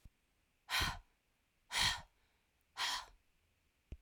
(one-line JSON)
{"exhalation_length": "4.0 s", "exhalation_amplitude": 2942, "exhalation_signal_mean_std_ratio": 0.37, "survey_phase": "alpha (2021-03-01 to 2021-08-12)", "age": "18-44", "gender": "Female", "wearing_mask": "No", "symptom_none": true, "smoker_status": "Never smoked", "respiratory_condition_asthma": true, "respiratory_condition_other": false, "recruitment_source": "REACT", "submission_delay": "1 day", "covid_test_result": "Negative", "covid_test_method": "RT-qPCR"}